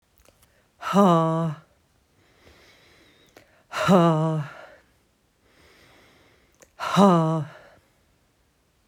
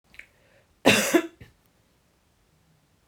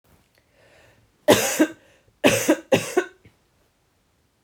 exhalation_length: 8.9 s
exhalation_amplitude: 22945
exhalation_signal_mean_std_ratio: 0.4
cough_length: 3.1 s
cough_amplitude: 26040
cough_signal_mean_std_ratio: 0.27
three_cough_length: 4.4 s
three_cough_amplitude: 29900
three_cough_signal_mean_std_ratio: 0.34
survey_phase: beta (2021-08-13 to 2022-03-07)
age: 45-64
gender: Female
wearing_mask: 'No'
symptom_cough_any: true
symptom_sore_throat: true
symptom_abdominal_pain: true
symptom_diarrhoea: true
symptom_fatigue: true
symptom_fever_high_temperature: true
symptom_change_to_sense_of_smell_or_taste: true
symptom_other: true
symptom_onset: 6 days
smoker_status: Never smoked
respiratory_condition_asthma: false
respiratory_condition_other: false
recruitment_source: Test and Trace
submission_delay: 3 days
covid_test_result: Positive
covid_test_method: RT-qPCR
covid_ct_value: 15.7
covid_ct_gene: ORF1ab gene
covid_ct_mean: 15.9
covid_viral_load: 6000000 copies/ml
covid_viral_load_category: High viral load (>1M copies/ml)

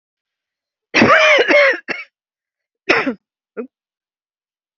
cough_length: 4.8 s
cough_amplitude: 31205
cough_signal_mean_std_ratio: 0.4
survey_phase: beta (2021-08-13 to 2022-03-07)
age: 45-64
gender: Female
wearing_mask: 'No'
symptom_runny_or_blocked_nose: true
smoker_status: Never smoked
respiratory_condition_asthma: false
respiratory_condition_other: false
recruitment_source: REACT
submission_delay: 2 days
covid_test_result: Negative
covid_test_method: RT-qPCR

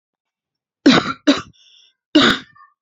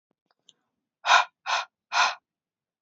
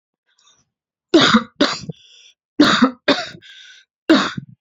cough_length: 2.8 s
cough_amplitude: 31600
cough_signal_mean_std_ratio: 0.36
exhalation_length: 2.8 s
exhalation_amplitude: 17462
exhalation_signal_mean_std_ratio: 0.33
three_cough_length: 4.6 s
three_cough_amplitude: 30995
three_cough_signal_mean_std_ratio: 0.4
survey_phase: beta (2021-08-13 to 2022-03-07)
age: 18-44
gender: Female
wearing_mask: 'No'
symptom_cough_any: true
symptom_runny_or_blocked_nose: true
symptom_abdominal_pain: true
symptom_fatigue: true
symptom_fever_high_temperature: true
symptom_headache: true
symptom_change_to_sense_of_smell_or_taste: true
symptom_loss_of_taste: true
symptom_other: true
symptom_onset: 3 days
smoker_status: Never smoked
respiratory_condition_asthma: false
respiratory_condition_other: false
recruitment_source: Test and Trace
submission_delay: 1 day
covid_test_result: Positive
covid_test_method: ePCR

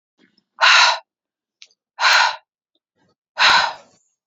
exhalation_length: 4.3 s
exhalation_amplitude: 30881
exhalation_signal_mean_std_ratio: 0.4
survey_phase: beta (2021-08-13 to 2022-03-07)
age: 18-44
gender: Female
wearing_mask: 'No'
symptom_none: true
smoker_status: Ex-smoker
respiratory_condition_asthma: false
respiratory_condition_other: false
recruitment_source: REACT
submission_delay: 2 days
covid_test_result: Negative
covid_test_method: RT-qPCR
influenza_a_test_result: Negative
influenza_b_test_result: Negative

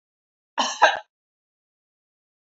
cough_length: 2.5 s
cough_amplitude: 27887
cough_signal_mean_std_ratio: 0.24
survey_phase: beta (2021-08-13 to 2022-03-07)
age: 65+
gender: Female
wearing_mask: 'No'
symptom_none: true
smoker_status: Ex-smoker
respiratory_condition_asthma: false
respiratory_condition_other: false
recruitment_source: REACT
submission_delay: 3 days
covid_test_result: Negative
covid_test_method: RT-qPCR
influenza_a_test_result: Negative
influenza_b_test_result: Negative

